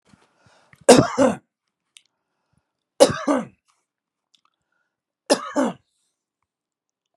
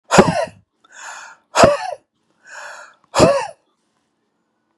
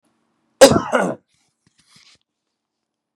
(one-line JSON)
{"three_cough_length": "7.2 s", "three_cough_amplitude": 32768, "three_cough_signal_mean_std_ratio": 0.25, "exhalation_length": "4.8 s", "exhalation_amplitude": 32768, "exhalation_signal_mean_std_ratio": 0.35, "cough_length": "3.2 s", "cough_amplitude": 32768, "cough_signal_mean_std_ratio": 0.24, "survey_phase": "beta (2021-08-13 to 2022-03-07)", "age": "65+", "gender": "Male", "wearing_mask": "No", "symptom_none": true, "smoker_status": "Never smoked", "respiratory_condition_asthma": false, "respiratory_condition_other": false, "recruitment_source": "REACT", "submission_delay": "1 day", "covid_test_result": "Negative", "covid_test_method": "RT-qPCR", "influenza_a_test_result": "Negative", "influenza_b_test_result": "Negative"}